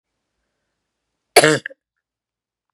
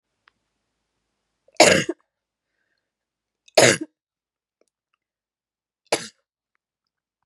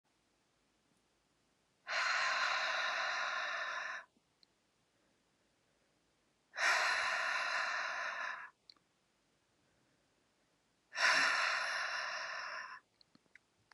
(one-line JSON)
{"cough_length": "2.7 s", "cough_amplitude": 32768, "cough_signal_mean_std_ratio": 0.19, "three_cough_length": "7.3 s", "three_cough_amplitude": 32614, "three_cough_signal_mean_std_ratio": 0.2, "exhalation_length": "13.7 s", "exhalation_amplitude": 3798, "exhalation_signal_mean_std_ratio": 0.55, "survey_phase": "beta (2021-08-13 to 2022-03-07)", "age": "18-44", "gender": "Female", "wearing_mask": "No", "symptom_new_continuous_cough": true, "symptom_runny_or_blocked_nose": true, "symptom_sore_throat": true, "symptom_abdominal_pain": true, "symptom_fatigue": true, "symptom_headache": true, "symptom_onset": "3 days", "smoker_status": "Never smoked", "respiratory_condition_asthma": true, "respiratory_condition_other": false, "recruitment_source": "Test and Trace", "submission_delay": "2 days", "covid_test_result": "Positive", "covid_test_method": "RT-qPCR", "covid_ct_value": 19.7, "covid_ct_gene": "N gene"}